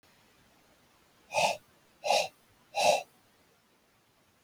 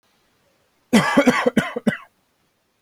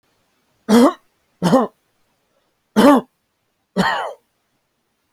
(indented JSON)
{
  "exhalation_length": "4.4 s",
  "exhalation_amplitude": 9251,
  "exhalation_signal_mean_std_ratio": 0.33,
  "cough_length": "2.8 s",
  "cough_amplitude": 28560,
  "cough_signal_mean_std_ratio": 0.39,
  "three_cough_length": "5.1 s",
  "three_cough_amplitude": 29644,
  "three_cough_signal_mean_std_ratio": 0.34,
  "survey_phase": "beta (2021-08-13 to 2022-03-07)",
  "age": "18-44",
  "gender": "Male",
  "wearing_mask": "No",
  "symptom_none": true,
  "smoker_status": "Current smoker (1 to 10 cigarettes per day)",
  "respiratory_condition_asthma": false,
  "respiratory_condition_other": false,
  "recruitment_source": "REACT",
  "submission_delay": "3 days",
  "covid_test_result": "Negative",
  "covid_test_method": "RT-qPCR"
}